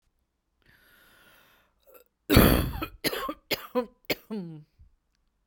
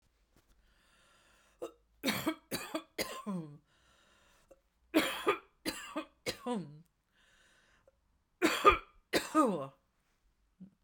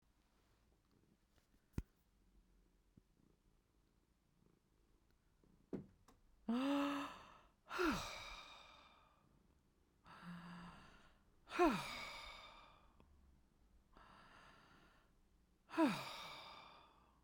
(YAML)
cough_length: 5.5 s
cough_amplitude: 19446
cough_signal_mean_std_ratio: 0.31
three_cough_length: 10.8 s
three_cough_amplitude: 10984
three_cough_signal_mean_std_ratio: 0.34
exhalation_length: 17.2 s
exhalation_amplitude: 2111
exhalation_signal_mean_std_ratio: 0.34
survey_phase: beta (2021-08-13 to 2022-03-07)
age: 45-64
gender: Female
wearing_mask: 'No'
symptom_cough_any: true
symptom_new_continuous_cough: true
symptom_runny_or_blocked_nose: true
symptom_sore_throat: true
symptom_abdominal_pain: true
symptom_fatigue: true
symptom_headache: true
symptom_onset: 3 days
smoker_status: Ex-smoker
respiratory_condition_asthma: false
respiratory_condition_other: false
recruitment_source: REACT
submission_delay: 1 day
covid_test_result: Positive
covid_test_method: RT-qPCR
covid_ct_value: 28.0
covid_ct_gene: E gene
influenza_a_test_result: Negative
influenza_b_test_result: Negative